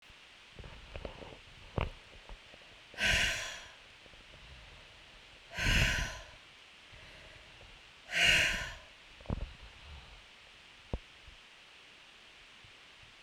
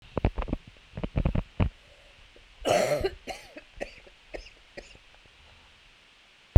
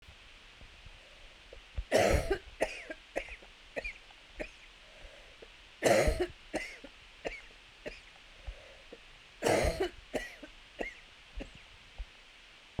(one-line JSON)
{"exhalation_length": "13.2 s", "exhalation_amplitude": 6404, "exhalation_signal_mean_std_ratio": 0.42, "cough_length": "6.6 s", "cough_amplitude": 25900, "cough_signal_mean_std_ratio": 0.3, "three_cough_length": "12.8 s", "three_cough_amplitude": 7011, "three_cough_signal_mean_std_ratio": 0.41, "survey_phase": "beta (2021-08-13 to 2022-03-07)", "age": "45-64", "gender": "Female", "wearing_mask": "No", "symptom_cough_any": true, "symptom_runny_or_blocked_nose": true, "symptom_shortness_of_breath": true, "symptom_sore_throat": true, "symptom_change_to_sense_of_smell_or_taste": true, "symptom_loss_of_taste": true, "smoker_status": "Never smoked", "respiratory_condition_asthma": false, "respiratory_condition_other": false, "recruitment_source": "Test and Trace", "submission_delay": "2 days", "covid_test_result": "Positive", "covid_test_method": "ePCR"}